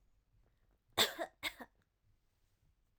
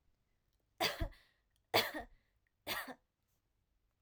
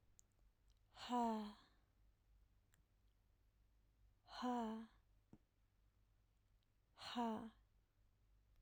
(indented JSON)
{
  "cough_length": "3.0 s",
  "cough_amplitude": 5097,
  "cough_signal_mean_std_ratio": 0.24,
  "three_cough_length": "4.0 s",
  "three_cough_amplitude": 5517,
  "three_cough_signal_mean_std_ratio": 0.3,
  "exhalation_length": "8.6 s",
  "exhalation_amplitude": 815,
  "exhalation_signal_mean_std_ratio": 0.37,
  "survey_phase": "alpha (2021-03-01 to 2021-08-12)",
  "age": "18-44",
  "gender": "Female",
  "wearing_mask": "No",
  "symptom_none": true,
  "smoker_status": "Never smoked",
  "respiratory_condition_asthma": false,
  "respiratory_condition_other": false,
  "recruitment_source": "REACT",
  "submission_delay": "1 day",
  "covid_test_result": "Negative",
  "covid_test_method": "RT-qPCR",
  "covid_ct_value": 44.0,
  "covid_ct_gene": "N gene"
}